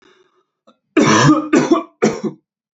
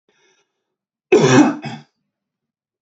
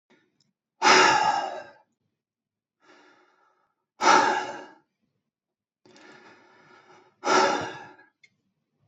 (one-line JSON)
{"three_cough_length": "2.7 s", "three_cough_amplitude": 31320, "three_cough_signal_mean_std_ratio": 0.51, "cough_length": "2.8 s", "cough_amplitude": 30319, "cough_signal_mean_std_ratio": 0.34, "exhalation_length": "8.9 s", "exhalation_amplitude": 21248, "exhalation_signal_mean_std_ratio": 0.34, "survey_phase": "beta (2021-08-13 to 2022-03-07)", "age": "18-44", "gender": "Male", "wearing_mask": "No", "symptom_runny_or_blocked_nose": true, "smoker_status": "Never smoked", "respiratory_condition_asthma": false, "respiratory_condition_other": false, "recruitment_source": "REACT", "submission_delay": "4 days", "covid_test_result": "Negative", "covid_test_method": "RT-qPCR", "influenza_a_test_result": "Negative", "influenza_b_test_result": "Negative"}